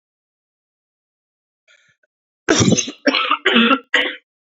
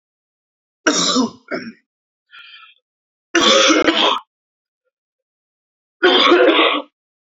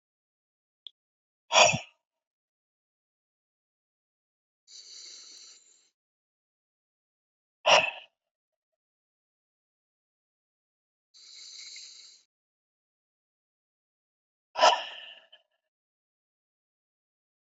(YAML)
cough_length: 4.4 s
cough_amplitude: 29294
cough_signal_mean_std_ratio: 0.41
three_cough_length: 7.3 s
three_cough_amplitude: 31182
three_cough_signal_mean_std_ratio: 0.46
exhalation_length: 17.5 s
exhalation_amplitude: 21299
exhalation_signal_mean_std_ratio: 0.17
survey_phase: beta (2021-08-13 to 2022-03-07)
age: 18-44
gender: Male
wearing_mask: 'No'
symptom_cough_any: true
symptom_runny_or_blocked_nose: true
symptom_sore_throat: true
symptom_headache: true
symptom_change_to_sense_of_smell_or_taste: true
symptom_loss_of_taste: true
symptom_other: true
symptom_onset: 4 days
smoker_status: Never smoked
respiratory_condition_asthma: false
respiratory_condition_other: false
recruitment_source: Test and Trace
submission_delay: 3 days
covid_test_result: Positive
covid_test_method: RT-qPCR